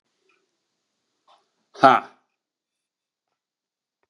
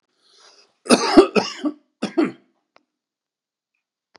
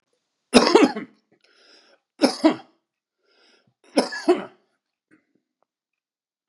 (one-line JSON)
{"exhalation_length": "4.1 s", "exhalation_amplitude": 30976, "exhalation_signal_mean_std_ratio": 0.15, "cough_length": "4.2 s", "cough_amplitude": 32767, "cough_signal_mean_std_ratio": 0.29, "three_cough_length": "6.5 s", "three_cough_amplitude": 32768, "three_cough_signal_mean_std_ratio": 0.27, "survey_phase": "beta (2021-08-13 to 2022-03-07)", "age": "45-64", "gender": "Male", "wearing_mask": "No", "symptom_none": true, "smoker_status": "Never smoked", "respiratory_condition_asthma": false, "respiratory_condition_other": false, "recruitment_source": "REACT", "submission_delay": "0 days", "covid_test_result": "Negative", "covid_test_method": "RT-qPCR", "influenza_a_test_result": "Negative", "influenza_b_test_result": "Negative"}